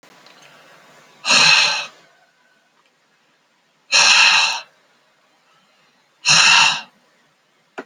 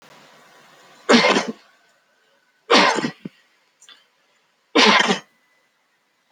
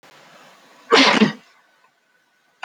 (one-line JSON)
{"exhalation_length": "7.9 s", "exhalation_amplitude": 32768, "exhalation_signal_mean_std_ratio": 0.4, "three_cough_length": "6.3 s", "three_cough_amplitude": 27448, "three_cough_signal_mean_std_ratio": 0.35, "cough_length": "2.6 s", "cough_amplitude": 30556, "cough_signal_mean_std_ratio": 0.33, "survey_phase": "alpha (2021-03-01 to 2021-08-12)", "age": "45-64", "gender": "Male", "wearing_mask": "No", "symptom_none": true, "smoker_status": "Ex-smoker", "respiratory_condition_asthma": false, "respiratory_condition_other": false, "recruitment_source": "REACT", "submission_delay": "1 day", "covid_test_result": "Negative", "covid_test_method": "RT-qPCR"}